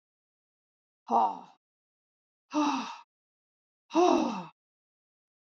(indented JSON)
{
  "exhalation_length": "5.5 s",
  "exhalation_amplitude": 9385,
  "exhalation_signal_mean_std_ratio": 0.35,
  "survey_phase": "beta (2021-08-13 to 2022-03-07)",
  "age": "65+",
  "gender": "Female",
  "wearing_mask": "No",
  "symptom_fatigue": true,
  "smoker_status": "Never smoked",
  "respiratory_condition_asthma": false,
  "respiratory_condition_other": false,
  "recruitment_source": "REACT",
  "submission_delay": "1 day",
  "covid_test_result": "Negative",
  "covid_test_method": "RT-qPCR",
  "influenza_a_test_result": "Negative",
  "influenza_b_test_result": "Negative"
}